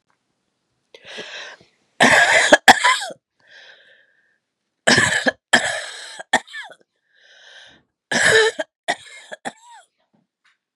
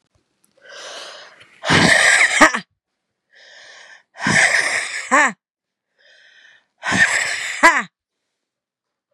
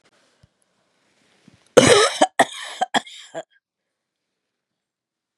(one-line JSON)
{"three_cough_length": "10.8 s", "three_cough_amplitude": 32768, "three_cough_signal_mean_std_ratio": 0.35, "exhalation_length": "9.1 s", "exhalation_amplitude": 32768, "exhalation_signal_mean_std_ratio": 0.43, "cough_length": "5.4 s", "cough_amplitude": 32768, "cough_signal_mean_std_ratio": 0.26, "survey_phase": "beta (2021-08-13 to 2022-03-07)", "age": "45-64", "gender": "Female", "wearing_mask": "No", "symptom_cough_any": true, "symptom_change_to_sense_of_smell_or_taste": true, "symptom_loss_of_taste": true, "symptom_onset": "3 days", "smoker_status": "Ex-smoker", "respiratory_condition_asthma": false, "respiratory_condition_other": false, "recruitment_source": "Test and Trace", "submission_delay": "2 days", "covid_test_result": "Positive", "covid_test_method": "ePCR"}